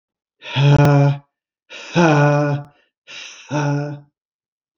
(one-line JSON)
{"exhalation_length": "4.8 s", "exhalation_amplitude": 27880, "exhalation_signal_mean_std_ratio": 0.53, "survey_phase": "beta (2021-08-13 to 2022-03-07)", "age": "45-64", "gender": "Male", "wearing_mask": "No", "symptom_none": true, "smoker_status": "Never smoked", "respiratory_condition_asthma": false, "respiratory_condition_other": false, "recruitment_source": "REACT", "submission_delay": "2 days", "covid_test_result": "Negative", "covid_test_method": "RT-qPCR", "influenza_a_test_result": "Negative", "influenza_b_test_result": "Negative"}